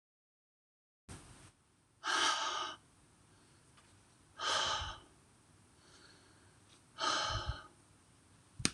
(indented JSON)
{
  "exhalation_length": "8.7 s",
  "exhalation_amplitude": 8795,
  "exhalation_signal_mean_std_ratio": 0.41,
  "survey_phase": "beta (2021-08-13 to 2022-03-07)",
  "age": "45-64",
  "gender": "Female",
  "wearing_mask": "No",
  "symptom_new_continuous_cough": true,
  "symptom_runny_or_blocked_nose": true,
  "symptom_sore_throat": true,
  "symptom_fatigue": true,
  "symptom_fever_high_temperature": true,
  "symptom_headache": true,
  "symptom_change_to_sense_of_smell_or_taste": true,
  "symptom_loss_of_taste": true,
  "symptom_onset": "3 days",
  "smoker_status": "Current smoker (11 or more cigarettes per day)",
  "respiratory_condition_asthma": false,
  "respiratory_condition_other": false,
  "recruitment_source": "Test and Trace",
  "submission_delay": "1 day",
  "covid_test_result": "Positive",
  "covid_test_method": "RT-qPCR",
  "covid_ct_value": 18.4,
  "covid_ct_gene": "ORF1ab gene",
  "covid_ct_mean": 18.8,
  "covid_viral_load": "710000 copies/ml",
  "covid_viral_load_category": "Low viral load (10K-1M copies/ml)"
}